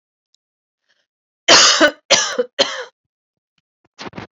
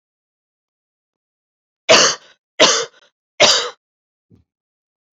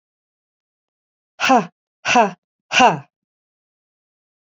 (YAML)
cough_length: 4.4 s
cough_amplitude: 32768
cough_signal_mean_std_ratio: 0.35
three_cough_length: 5.1 s
three_cough_amplitude: 32768
three_cough_signal_mean_std_ratio: 0.3
exhalation_length: 4.5 s
exhalation_amplitude: 32767
exhalation_signal_mean_std_ratio: 0.3
survey_phase: beta (2021-08-13 to 2022-03-07)
age: 45-64
gender: Female
wearing_mask: 'No'
symptom_cough_any: true
symptom_new_continuous_cough: true
symptom_runny_or_blocked_nose: true
symptom_sore_throat: true
symptom_onset: 2 days
smoker_status: Never smoked
respiratory_condition_asthma: false
respiratory_condition_other: false
recruitment_source: Test and Trace
submission_delay: 1 day
covid_test_result: Positive
covid_test_method: RT-qPCR
covid_ct_value: 18.0
covid_ct_gene: N gene